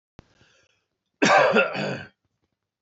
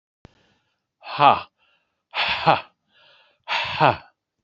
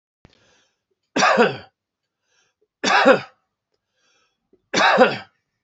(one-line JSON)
{"cough_length": "2.8 s", "cough_amplitude": 17637, "cough_signal_mean_std_ratio": 0.39, "exhalation_length": "4.4 s", "exhalation_amplitude": 27252, "exhalation_signal_mean_std_ratio": 0.34, "three_cough_length": "5.6 s", "three_cough_amplitude": 27979, "three_cough_signal_mean_std_ratio": 0.36, "survey_phase": "alpha (2021-03-01 to 2021-08-12)", "age": "45-64", "gender": "Male", "wearing_mask": "No", "symptom_cough_any": true, "symptom_headache": true, "smoker_status": "Ex-smoker", "respiratory_condition_asthma": false, "respiratory_condition_other": false, "recruitment_source": "Test and Trace", "submission_delay": "2 days", "covid_test_result": "Positive", "covid_test_method": "RT-qPCR", "covid_ct_value": 17.9, "covid_ct_gene": "ORF1ab gene", "covid_ct_mean": 18.5, "covid_viral_load": "840000 copies/ml", "covid_viral_load_category": "Low viral load (10K-1M copies/ml)"}